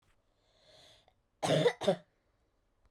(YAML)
cough_length: 2.9 s
cough_amplitude: 5083
cough_signal_mean_std_ratio: 0.31
survey_phase: beta (2021-08-13 to 2022-03-07)
age: 18-44
gender: Female
wearing_mask: 'No'
symptom_cough_any: true
symptom_runny_or_blocked_nose: true
symptom_shortness_of_breath: true
symptom_sore_throat: true
symptom_abdominal_pain: true
symptom_diarrhoea: true
symptom_fatigue: true
symptom_headache: true
smoker_status: Never smoked
respiratory_condition_asthma: false
respiratory_condition_other: false
recruitment_source: Test and Trace
submission_delay: 2 days
covid_test_result: Positive
covid_test_method: LFT